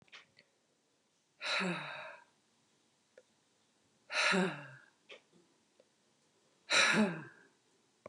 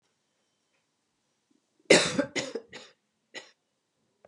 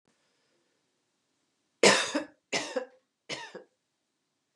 {
  "exhalation_length": "8.1 s",
  "exhalation_amplitude": 5154,
  "exhalation_signal_mean_std_ratio": 0.35,
  "cough_length": "4.3 s",
  "cough_amplitude": 21101,
  "cough_signal_mean_std_ratio": 0.23,
  "three_cough_length": "4.6 s",
  "three_cough_amplitude": 15402,
  "three_cough_signal_mean_std_ratio": 0.26,
  "survey_phase": "beta (2021-08-13 to 2022-03-07)",
  "age": "45-64",
  "gender": "Female",
  "wearing_mask": "No",
  "symptom_new_continuous_cough": true,
  "symptom_sore_throat": true,
  "symptom_change_to_sense_of_smell_or_taste": true,
  "symptom_loss_of_taste": true,
  "symptom_onset": "2 days",
  "smoker_status": "Never smoked",
  "respiratory_condition_asthma": false,
  "respiratory_condition_other": false,
  "recruitment_source": "Test and Trace",
  "submission_delay": "1 day",
  "covid_test_result": "Positive",
  "covid_test_method": "RT-qPCR",
  "covid_ct_value": 28.7,
  "covid_ct_gene": "N gene"
}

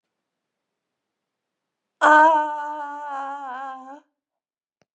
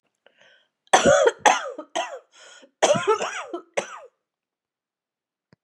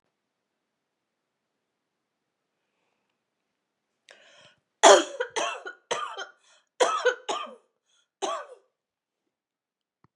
{
  "exhalation_length": "4.9 s",
  "exhalation_amplitude": 24929,
  "exhalation_signal_mean_std_ratio": 0.34,
  "cough_length": "5.6 s",
  "cough_amplitude": 32351,
  "cough_signal_mean_std_ratio": 0.37,
  "three_cough_length": "10.2 s",
  "three_cough_amplitude": 29128,
  "three_cough_signal_mean_std_ratio": 0.22,
  "survey_phase": "beta (2021-08-13 to 2022-03-07)",
  "age": "65+",
  "gender": "Female",
  "wearing_mask": "No",
  "symptom_cough_any": true,
  "symptom_runny_or_blocked_nose": true,
  "symptom_fatigue": true,
  "symptom_fever_high_temperature": true,
  "symptom_change_to_sense_of_smell_or_taste": true,
  "symptom_onset": "4 days",
  "smoker_status": "Never smoked",
  "respiratory_condition_asthma": false,
  "respiratory_condition_other": false,
  "recruitment_source": "Test and Trace",
  "submission_delay": "2 days",
  "covid_test_result": "Positive",
  "covid_test_method": "RT-qPCR",
  "covid_ct_value": 23.8,
  "covid_ct_gene": "ORF1ab gene"
}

